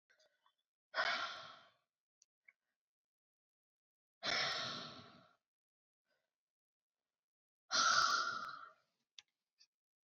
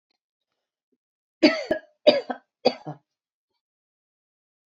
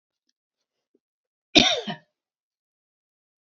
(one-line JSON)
{"exhalation_length": "10.2 s", "exhalation_amplitude": 3120, "exhalation_signal_mean_std_ratio": 0.33, "three_cough_length": "4.8 s", "three_cough_amplitude": 25600, "three_cough_signal_mean_std_ratio": 0.23, "cough_length": "3.4 s", "cough_amplitude": 29953, "cough_signal_mean_std_ratio": 0.2, "survey_phase": "beta (2021-08-13 to 2022-03-07)", "age": "18-44", "gender": "Female", "wearing_mask": "No", "symptom_none": true, "smoker_status": "Never smoked", "respiratory_condition_asthma": false, "respiratory_condition_other": false, "recruitment_source": "REACT", "submission_delay": "2 days", "covid_test_result": "Negative", "covid_test_method": "RT-qPCR"}